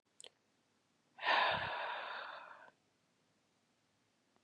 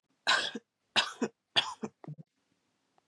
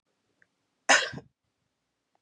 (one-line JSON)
{"exhalation_length": "4.4 s", "exhalation_amplitude": 3659, "exhalation_signal_mean_std_ratio": 0.38, "three_cough_length": "3.1 s", "three_cough_amplitude": 8114, "three_cough_signal_mean_std_ratio": 0.35, "cough_length": "2.2 s", "cough_amplitude": 13968, "cough_signal_mean_std_ratio": 0.22, "survey_phase": "beta (2021-08-13 to 2022-03-07)", "age": "18-44", "gender": "Female", "wearing_mask": "No", "symptom_none": true, "smoker_status": "Never smoked", "respiratory_condition_asthma": false, "respiratory_condition_other": false, "recruitment_source": "Test and Trace", "submission_delay": "2 days", "covid_test_result": "Positive", "covid_test_method": "RT-qPCR", "covid_ct_value": 17.5, "covid_ct_gene": "ORF1ab gene"}